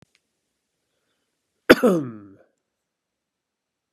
{
  "cough_length": "3.9 s",
  "cough_amplitude": 32768,
  "cough_signal_mean_std_ratio": 0.2,
  "survey_phase": "beta (2021-08-13 to 2022-03-07)",
  "age": "65+",
  "gender": "Male",
  "wearing_mask": "No",
  "symptom_none": true,
  "smoker_status": "Never smoked",
  "respiratory_condition_asthma": true,
  "respiratory_condition_other": false,
  "recruitment_source": "REACT",
  "submission_delay": "4 days",
  "covid_test_result": "Negative",
  "covid_test_method": "RT-qPCR",
  "influenza_a_test_result": "Negative",
  "influenza_b_test_result": "Negative"
}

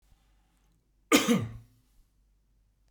{
  "cough_length": "2.9 s",
  "cough_amplitude": 14346,
  "cough_signal_mean_std_ratio": 0.28,
  "survey_phase": "beta (2021-08-13 to 2022-03-07)",
  "age": "45-64",
  "gender": "Male",
  "wearing_mask": "No",
  "symptom_none": true,
  "smoker_status": "Never smoked",
  "respiratory_condition_asthma": false,
  "respiratory_condition_other": false,
  "recruitment_source": "REACT",
  "submission_delay": "1 day",
  "covid_test_result": "Negative",
  "covid_test_method": "RT-qPCR"
}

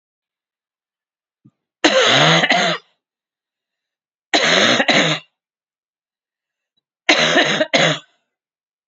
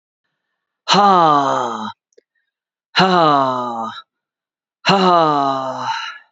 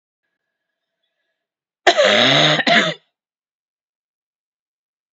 {
  "three_cough_length": "8.9 s",
  "three_cough_amplitude": 32767,
  "three_cough_signal_mean_std_ratio": 0.44,
  "exhalation_length": "6.3 s",
  "exhalation_amplitude": 30306,
  "exhalation_signal_mean_std_ratio": 0.55,
  "cough_length": "5.1 s",
  "cough_amplitude": 30982,
  "cough_signal_mean_std_ratio": 0.36,
  "survey_phase": "beta (2021-08-13 to 2022-03-07)",
  "age": "45-64",
  "gender": "Female",
  "wearing_mask": "No",
  "symptom_cough_any": true,
  "symptom_new_continuous_cough": true,
  "symptom_runny_or_blocked_nose": true,
  "symptom_sore_throat": true,
  "symptom_fatigue": true,
  "symptom_onset": "4 days",
  "smoker_status": "Never smoked",
  "respiratory_condition_asthma": false,
  "respiratory_condition_other": false,
  "recruitment_source": "Test and Trace",
  "submission_delay": "2 days",
  "covid_test_result": "Positive",
  "covid_test_method": "RT-qPCR",
  "covid_ct_value": 19.7,
  "covid_ct_gene": "N gene"
}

